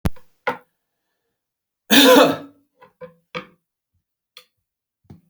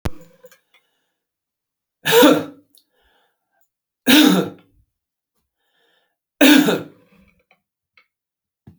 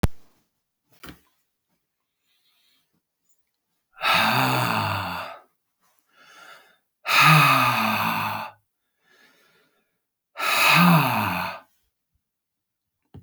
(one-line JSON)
{"cough_length": "5.3 s", "cough_amplitude": 32768, "cough_signal_mean_std_ratio": 0.27, "three_cough_length": "8.8 s", "three_cough_amplitude": 32768, "three_cough_signal_mean_std_ratio": 0.3, "exhalation_length": "13.2 s", "exhalation_amplitude": 20800, "exhalation_signal_mean_std_ratio": 0.43, "survey_phase": "beta (2021-08-13 to 2022-03-07)", "age": "65+", "gender": "Male", "wearing_mask": "No", "symptom_none": true, "smoker_status": "Ex-smoker", "respiratory_condition_asthma": false, "respiratory_condition_other": false, "recruitment_source": "REACT", "submission_delay": "2 days", "covid_test_result": "Negative", "covid_test_method": "RT-qPCR"}